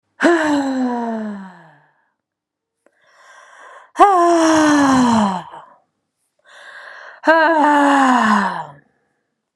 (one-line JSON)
{"exhalation_length": "9.6 s", "exhalation_amplitude": 32767, "exhalation_signal_mean_std_ratio": 0.58, "survey_phase": "beta (2021-08-13 to 2022-03-07)", "age": "18-44", "gender": "Female", "wearing_mask": "No", "symptom_none": true, "smoker_status": "Never smoked", "respiratory_condition_asthma": false, "respiratory_condition_other": false, "recruitment_source": "REACT", "submission_delay": "6 days", "covid_test_result": "Negative", "covid_test_method": "RT-qPCR"}